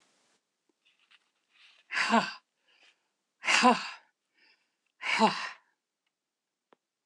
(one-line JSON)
{"exhalation_length": "7.1 s", "exhalation_amplitude": 12104, "exhalation_signal_mean_std_ratio": 0.3, "survey_phase": "beta (2021-08-13 to 2022-03-07)", "age": "65+", "gender": "Female", "wearing_mask": "No", "symptom_cough_any": true, "symptom_runny_or_blocked_nose": true, "smoker_status": "Never smoked", "respiratory_condition_asthma": false, "respiratory_condition_other": false, "recruitment_source": "REACT", "submission_delay": "0 days", "covid_test_result": "Negative", "covid_test_method": "RT-qPCR"}